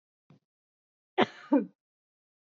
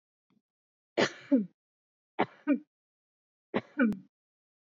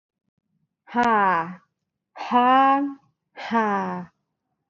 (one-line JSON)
{"cough_length": "2.6 s", "cough_amplitude": 14411, "cough_signal_mean_std_ratio": 0.22, "three_cough_length": "4.7 s", "three_cough_amplitude": 7712, "three_cough_signal_mean_std_ratio": 0.3, "exhalation_length": "4.7 s", "exhalation_amplitude": 14414, "exhalation_signal_mean_std_ratio": 0.51, "survey_phase": "beta (2021-08-13 to 2022-03-07)", "age": "18-44", "gender": "Female", "wearing_mask": "No", "symptom_none": true, "smoker_status": "Prefer not to say", "respiratory_condition_asthma": false, "respiratory_condition_other": false, "recruitment_source": "REACT", "submission_delay": "1 day", "covid_test_result": "Negative", "covid_test_method": "RT-qPCR", "influenza_a_test_result": "Negative", "influenza_b_test_result": "Negative"}